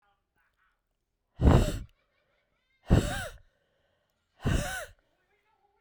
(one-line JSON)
{"exhalation_length": "5.8 s", "exhalation_amplitude": 14395, "exhalation_signal_mean_std_ratio": 0.3, "survey_phase": "beta (2021-08-13 to 2022-03-07)", "age": "45-64", "gender": "Female", "wearing_mask": "No", "symptom_new_continuous_cough": true, "symptom_runny_or_blocked_nose": true, "symptom_shortness_of_breath": true, "symptom_fatigue": true, "symptom_headache": true, "smoker_status": "Never smoked", "respiratory_condition_asthma": false, "respiratory_condition_other": false, "recruitment_source": "Test and Trace", "submission_delay": "1 day", "covid_test_result": "Positive", "covid_test_method": "RT-qPCR", "covid_ct_value": 20.0, "covid_ct_gene": "S gene", "covid_ct_mean": 20.8, "covid_viral_load": "150000 copies/ml", "covid_viral_load_category": "Low viral load (10K-1M copies/ml)"}